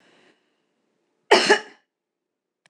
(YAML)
cough_length: 2.7 s
cough_amplitude: 26027
cough_signal_mean_std_ratio: 0.24
survey_phase: alpha (2021-03-01 to 2021-08-12)
age: 45-64
gender: Female
wearing_mask: 'No'
symptom_none: true
smoker_status: Never smoked
respiratory_condition_asthma: false
respiratory_condition_other: false
recruitment_source: REACT
submission_delay: 3 days
covid_test_result: Negative
covid_test_method: RT-qPCR